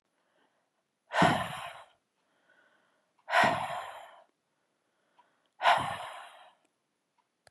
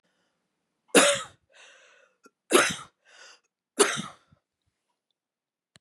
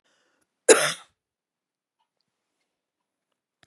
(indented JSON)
{
  "exhalation_length": "7.5 s",
  "exhalation_amplitude": 9402,
  "exhalation_signal_mean_std_ratio": 0.32,
  "three_cough_length": "5.8 s",
  "three_cough_amplitude": 20960,
  "three_cough_signal_mean_std_ratio": 0.26,
  "cough_length": "3.7 s",
  "cough_amplitude": 32767,
  "cough_signal_mean_std_ratio": 0.16,
  "survey_phase": "beta (2021-08-13 to 2022-03-07)",
  "age": "18-44",
  "gender": "Female",
  "wearing_mask": "No",
  "symptom_none": true,
  "smoker_status": "Ex-smoker",
  "respiratory_condition_asthma": false,
  "respiratory_condition_other": false,
  "recruitment_source": "REACT",
  "submission_delay": "1 day",
  "covid_test_result": "Negative",
  "covid_test_method": "RT-qPCR",
  "influenza_a_test_result": "Unknown/Void",
  "influenza_b_test_result": "Unknown/Void"
}